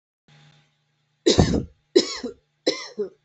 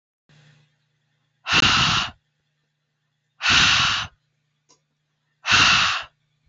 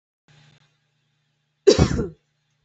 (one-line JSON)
{"three_cough_length": "3.2 s", "three_cough_amplitude": 24420, "three_cough_signal_mean_std_ratio": 0.35, "exhalation_length": "6.5 s", "exhalation_amplitude": 23137, "exhalation_signal_mean_std_ratio": 0.43, "cough_length": "2.6 s", "cough_amplitude": 27131, "cough_signal_mean_std_ratio": 0.25, "survey_phase": "beta (2021-08-13 to 2022-03-07)", "age": "18-44", "gender": "Female", "wearing_mask": "No", "symptom_none": true, "smoker_status": "Never smoked", "respiratory_condition_asthma": false, "respiratory_condition_other": false, "recruitment_source": "REACT", "submission_delay": "0 days", "covid_test_result": "Negative", "covid_test_method": "RT-qPCR", "influenza_a_test_result": "Negative", "influenza_b_test_result": "Negative"}